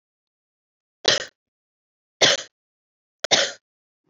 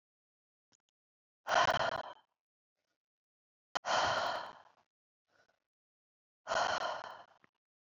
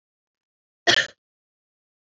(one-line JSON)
{"three_cough_length": "4.1 s", "three_cough_amplitude": 28037, "three_cough_signal_mean_std_ratio": 0.26, "exhalation_length": "7.9 s", "exhalation_amplitude": 5022, "exhalation_signal_mean_std_ratio": 0.36, "cough_length": "2.0 s", "cough_amplitude": 24584, "cough_signal_mean_std_ratio": 0.21, "survey_phase": "beta (2021-08-13 to 2022-03-07)", "age": "18-44", "gender": "Female", "wearing_mask": "No", "symptom_cough_any": true, "symptom_runny_or_blocked_nose": true, "symptom_diarrhoea": true, "symptom_fatigue": true, "symptom_headache": true, "symptom_onset": "4 days", "smoker_status": "Never smoked", "respiratory_condition_asthma": false, "respiratory_condition_other": false, "recruitment_source": "Test and Trace", "submission_delay": "2 days", "covid_test_result": "Positive", "covid_test_method": "RT-qPCR", "covid_ct_value": 27.4, "covid_ct_gene": "ORF1ab gene", "covid_ct_mean": 27.6, "covid_viral_load": "880 copies/ml", "covid_viral_load_category": "Minimal viral load (< 10K copies/ml)"}